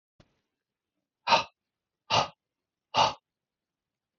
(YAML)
exhalation_length: 4.2 s
exhalation_amplitude: 12218
exhalation_signal_mean_std_ratio: 0.26
survey_phase: beta (2021-08-13 to 2022-03-07)
age: 45-64
gender: Male
wearing_mask: 'No'
symptom_none: true
smoker_status: Ex-smoker
respiratory_condition_asthma: true
respiratory_condition_other: false
recruitment_source: REACT
submission_delay: 15 days
covid_test_result: Negative
covid_test_method: RT-qPCR